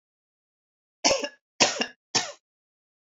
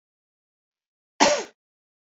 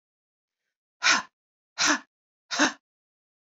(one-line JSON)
{"three_cough_length": "3.2 s", "three_cough_amplitude": 21233, "three_cough_signal_mean_std_ratio": 0.3, "cough_length": "2.1 s", "cough_amplitude": 26056, "cough_signal_mean_std_ratio": 0.24, "exhalation_length": "3.5 s", "exhalation_amplitude": 14814, "exhalation_signal_mean_std_ratio": 0.31, "survey_phase": "beta (2021-08-13 to 2022-03-07)", "age": "45-64", "gender": "Female", "wearing_mask": "No", "symptom_none": true, "smoker_status": "Never smoked", "respiratory_condition_asthma": false, "respiratory_condition_other": false, "recruitment_source": "Test and Trace", "submission_delay": "1 day", "covid_test_result": "Negative", "covid_test_method": "RT-qPCR"}